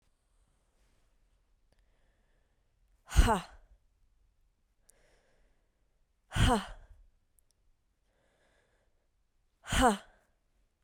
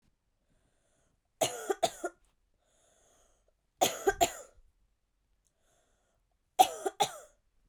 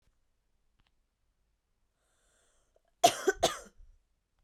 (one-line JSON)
{"exhalation_length": "10.8 s", "exhalation_amplitude": 10232, "exhalation_signal_mean_std_ratio": 0.23, "three_cough_length": "7.7 s", "three_cough_amplitude": 12616, "three_cough_signal_mean_std_ratio": 0.25, "cough_length": "4.4 s", "cough_amplitude": 11137, "cough_signal_mean_std_ratio": 0.19, "survey_phase": "beta (2021-08-13 to 2022-03-07)", "age": "18-44", "gender": "Female", "wearing_mask": "Yes", "symptom_cough_any": true, "symptom_runny_or_blocked_nose": true, "symptom_abdominal_pain": true, "symptom_diarrhoea": true, "symptom_fatigue": true, "symptom_fever_high_temperature": true, "symptom_headache": true, "symptom_onset": "3 days", "smoker_status": "Ex-smoker", "respiratory_condition_asthma": false, "respiratory_condition_other": false, "recruitment_source": "Test and Trace", "submission_delay": "3 days", "covid_test_result": "Positive", "covid_test_method": "RT-qPCR", "covid_ct_value": 19.2, "covid_ct_gene": "ORF1ab gene", "covid_ct_mean": 19.9, "covid_viral_load": "310000 copies/ml", "covid_viral_load_category": "Low viral load (10K-1M copies/ml)"}